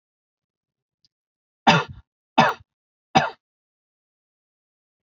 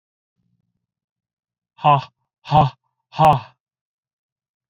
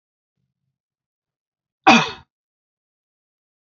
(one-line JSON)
{"three_cough_length": "5.0 s", "three_cough_amplitude": 32733, "three_cough_signal_mean_std_ratio": 0.22, "exhalation_length": "4.7 s", "exhalation_amplitude": 28350, "exhalation_signal_mean_std_ratio": 0.27, "cough_length": "3.7 s", "cough_amplitude": 29882, "cough_signal_mean_std_ratio": 0.18, "survey_phase": "beta (2021-08-13 to 2022-03-07)", "age": "18-44", "gender": "Male", "wearing_mask": "No", "symptom_none": true, "smoker_status": "Ex-smoker", "respiratory_condition_asthma": false, "respiratory_condition_other": false, "recruitment_source": "REACT", "submission_delay": "1 day", "covid_test_result": "Negative", "covid_test_method": "RT-qPCR"}